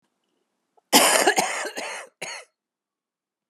{"cough_length": "3.5 s", "cough_amplitude": 30640, "cough_signal_mean_std_ratio": 0.37, "survey_phase": "alpha (2021-03-01 to 2021-08-12)", "age": "65+", "gender": "Female", "wearing_mask": "No", "symptom_cough_any": true, "symptom_fatigue": true, "symptom_headache": true, "smoker_status": "Never smoked", "respiratory_condition_asthma": false, "respiratory_condition_other": false, "recruitment_source": "Test and Trace", "submission_delay": "2 days", "covid_test_result": "Positive", "covid_test_method": "RT-qPCR", "covid_ct_value": 12.7, "covid_ct_gene": "ORF1ab gene", "covid_ct_mean": 13.0, "covid_viral_load": "53000000 copies/ml", "covid_viral_load_category": "High viral load (>1M copies/ml)"}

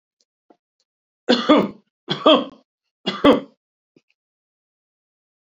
{"three_cough_length": "5.5 s", "three_cough_amplitude": 28923, "three_cough_signal_mean_std_ratio": 0.29, "survey_phase": "beta (2021-08-13 to 2022-03-07)", "age": "65+", "gender": "Male", "wearing_mask": "No", "symptom_shortness_of_breath": true, "symptom_onset": "6 days", "smoker_status": "Ex-smoker", "respiratory_condition_asthma": false, "respiratory_condition_other": false, "recruitment_source": "REACT", "submission_delay": "0 days", "covid_test_result": "Negative", "covid_test_method": "RT-qPCR", "influenza_a_test_result": "Negative", "influenza_b_test_result": "Negative"}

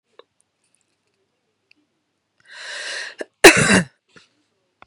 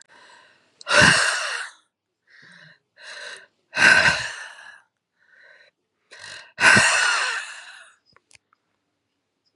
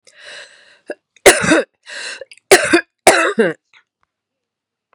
{"cough_length": "4.9 s", "cough_amplitude": 32768, "cough_signal_mean_std_ratio": 0.23, "exhalation_length": "9.6 s", "exhalation_amplitude": 29678, "exhalation_signal_mean_std_ratio": 0.37, "three_cough_length": "4.9 s", "three_cough_amplitude": 32768, "three_cough_signal_mean_std_ratio": 0.36, "survey_phase": "beta (2021-08-13 to 2022-03-07)", "age": "45-64", "gender": "Female", "wearing_mask": "No", "symptom_cough_any": true, "symptom_new_continuous_cough": true, "symptom_runny_or_blocked_nose": true, "symptom_shortness_of_breath": true, "symptom_sore_throat": true, "symptom_fatigue": true, "symptom_fever_high_temperature": true, "symptom_headache": true, "smoker_status": "Never smoked", "respiratory_condition_asthma": false, "respiratory_condition_other": false, "recruitment_source": "Test and Trace", "submission_delay": "2 days", "covid_test_result": "Positive", "covid_test_method": "RT-qPCR", "covid_ct_value": 19.7, "covid_ct_gene": "N gene"}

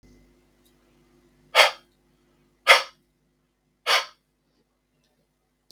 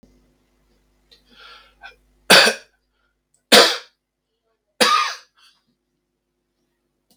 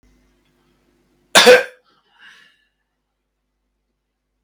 {"exhalation_length": "5.7 s", "exhalation_amplitude": 32768, "exhalation_signal_mean_std_ratio": 0.21, "three_cough_length": "7.2 s", "three_cough_amplitude": 32768, "three_cough_signal_mean_std_ratio": 0.25, "cough_length": "4.4 s", "cough_amplitude": 32768, "cough_signal_mean_std_ratio": 0.21, "survey_phase": "beta (2021-08-13 to 2022-03-07)", "age": "45-64", "gender": "Male", "wearing_mask": "No", "symptom_none": true, "smoker_status": "Never smoked", "respiratory_condition_asthma": false, "respiratory_condition_other": false, "recruitment_source": "REACT", "submission_delay": "-1 day", "covid_test_result": "Negative", "covid_test_method": "RT-qPCR", "influenza_a_test_result": "Unknown/Void", "influenza_b_test_result": "Unknown/Void"}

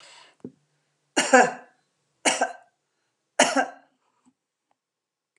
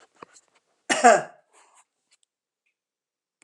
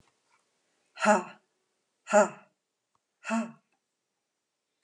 {"three_cough_length": "5.4 s", "three_cough_amplitude": 28851, "three_cough_signal_mean_std_ratio": 0.27, "cough_length": "3.4 s", "cough_amplitude": 27403, "cough_signal_mean_std_ratio": 0.21, "exhalation_length": "4.8 s", "exhalation_amplitude": 12003, "exhalation_signal_mean_std_ratio": 0.26, "survey_phase": "alpha (2021-03-01 to 2021-08-12)", "age": "65+", "gender": "Female", "wearing_mask": "No", "symptom_none": true, "smoker_status": "Ex-smoker", "respiratory_condition_asthma": false, "respiratory_condition_other": false, "recruitment_source": "REACT", "submission_delay": "1 day", "covid_test_result": "Negative", "covid_test_method": "RT-qPCR"}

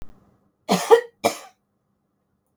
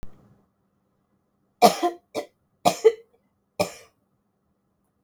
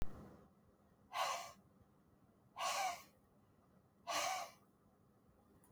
{"cough_length": "2.6 s", "cough_amplitude": 31844, "cough_signal_mean_std_ratio": 0.27, "three_cough_length": "5.0 s", "three_cough_amplitude": 32237, "three_cough_signal_mean_std_ratio": 0.24, "exhalation_length": "5.7 s", "exhalation_amplitude": 1418, "exhalation_signal_mean_std_ratio": 0.44, "survey_phase": "beta (2021-08-13 to 2022-03-07)", "age": "45-64", "gender": "Female", "wearing_mask": "No", "symptom_cough_any": true, "symptom_runny_or_blocked_nose": true, "symptom_shortness_of_breath": true, "symptom_onset": "12 days", "smoker_status": "Never smoked", "respiratory_condition_asthma": true, "respiratory_condition_other": false, "recruitment_source": "REACT", "submission_delay": "0 days", "covid_test_result": "Negative", "covid_test_method": "RT-qPCR", "influenza_a_test_result": "Negative", "influenza_b_test_result": "Negative"}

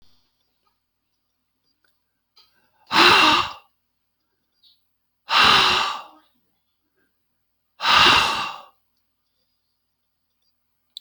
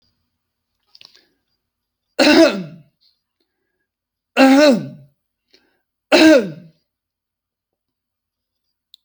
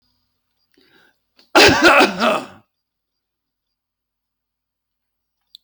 {"exhalation_length": "11.0 s", "exhalation_amplitude": 28863, "exhalation_signal_mean_std_ratio": 0.33, "three_cough_length": "9.0 s", "three_cough_amplitude": 30668, "three_cough_signal_mean_std_ratio": 0.31, "cough_length": "5.6 s", "cough_amplitude": 32387, "cough_signal_mean_std_ratio": 0.29, "survey_phase": "alpha (2021-03-01 to 2021-08-12)", "age": "65+", "gender": "Male", "wearing_mask": "No", "symptom_none": true, "smoker_status": "Ex-smoker", "respiratory_condition_asthma": false, "respiratory_condition_other": false, "recruitment_source": "REACT", "submission_delay": "1 day", "covid_test_result": "Negative", "covid_test_method": "RT-qPCR"}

